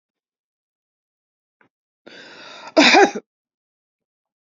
{
  "cough_length": "4.4 s",
  "cough_amplitude": 30964,
  "cough_signal_mean_std_ratio": 0.24,
  "survey_phase": "beta (2021-08-13 to 2022-03-07)",
  "age": "65+",
  "gender": "Female",
  "wearing_mask": "No",
  "symptom_runny_or_blocked_nose": true,
  "symptom_fatigue": true,
  "smoker_status": "Never smoked",
  "respiratory_condition_asthma": false,
  "respiratory_condition_other": false,
  "recruitment_source": "REACT",
  "submission_delay": "1 day",
  "covid_test_result": "Negative",
  "covid_test_method": "RT-qPCR"
}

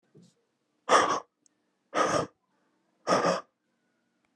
{
  "exhalation_length": "4.4 s",
  "exhalation_amplitude": 12860,
  "exhalation_signal_mean_std_ratio": 0.37,
  "survey_phase": "alpha (2021-03-01 to 2021-08-12)",
  "age": "45-64",
  "gender": "Male",
  "wearing_mask": "No",
  "symptom_none": true,
  "symptom_onset": "4 days",
  "smoker_status": "Never smoked",
  "respiratory_condition_asthma": true,
  "respiratory_condition_other": false,
  "recruitment_source": "REACT",
  "submission_delay": "1 day",
  "covid_test_result": "Negative",
  "covid_test_method": "RT-qPCR"
}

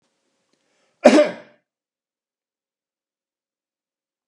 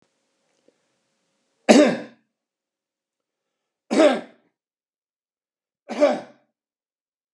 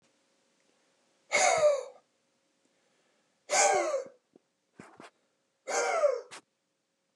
{
  "cough_length": "4.3 s",
  "cough_amplitude": 32768,
  "cough_signal_mean_std_ratio": 0.18,
  "three_cough_length": "7.3 s",
  "three_cough_amplitude": 31474,
  "three_cough_signal_mean_std_ratio": 0.24,
  "exhalation_length": "7.2 s",
  "exhalation_amplitude": 8656,
  "exhalation_signal_mean_std_ratio": 0.39,
  "survey_phase": "beta (2021-08-13 to 2022-03-07)",
  "age": "65+",
  "gender": "Male",
  "wearing_mask": "No",
  "symptom_none": true,
  "smoker_status": "Never smoked",
  "respiratory_condition_asthma": false,
  "respiratory_condition_other": false,
  "recruitment_source": "REACT",
  "submission_delay": "2 days",
  "covid_test_result": "Negative",
  "covid_test_method": "RT-qPCR",
  "influenza_a_test_result": "Negative",
  "influenza_b_test_result": "Negative"
}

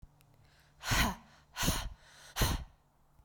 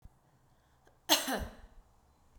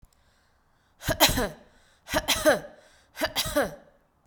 {
  "exhalation_length": "3.2 s",
  "exhalation_amplitude": 5334,
  "exhalation_signal_mean_std_ratio": 0.45,
  "cough_length": "2.4 s",
  "cough_amplitude": 11387,
  "cough_signal_mean_std_ratio": 0.3,
  "three_cough_length": "4.3 s",
  "three_cough_amplitude": 20451,
  "three_cough_signal_mean_std_ratio": 0.41,
  "survey_phase": "beta (2021-08-13 to 2022-03-07)",
  "age": "18-44",
  "gender": "Female",
  "wearing_mask": "No",
  "symptom_none": true,
  "smoker_status": "Never smoked",
  "respiratory_condition_asthma": false,
  "respiratory_condition_other": false,
  "recruitment_source": "REACT",
  "submission_delay": "11 days",
  "covid_test_result": "Negative",
  "covid_test_method": "RT-qPCR"
}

